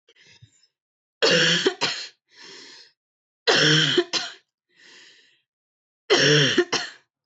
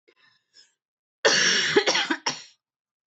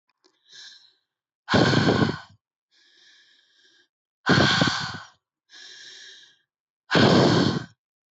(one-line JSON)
{"three_cough_length": "7.3 s", "three_cough_amplitude": 17313, "three_cough_signal_mean_std_ratio": 0.45, "cough_length": "3.1 s", "cough_amplitude": 17652, "cough_signal_mean_std_ratio": 0.45, "exhalation_length": "8.1 s", "exhalation_amplitude": 18390, "exhalation_signal_mean_std_ratio": 0.42, "survey_phase": "alpha (2021-03-01 to 2021-08-12)", "age": "18-44", "gender": "Female", "wearing_mask": "No", "symptom_none": true, "smoker_status": "Ex-smoker", "respiratory_condition_asthma": false, "respiratory_condition_other": false, "recruitment_source": "REACT", "submission_delay": "5 days", "covid_test_result": "Negative", "covid_test_method": "RT-qPCR"}